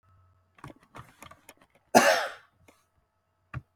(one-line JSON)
{"cough_length": "3.8 s", "cough_amplitude": 23242, "cough_signal_mean_std_ratio": 0.24, "survey_phase": "beta (2021-08-13 to 2022-03-07)", "age": "45-64", "gender": "Male", "wearing_mask": "No", "symptom_none": true, "smoker_status": "Ex-smoker", "respiratory_condition_asthma": true, "respiratory_condition_other": true, "recruitment_source": "REACT", "submission_delay": "1 day", "covid_test_result": "Negative", "covid_test_method": "RT-qPCR", "influenza_a_test_result": "Unknown/Void", "influenza_b_test_result": "Unknown/Void"}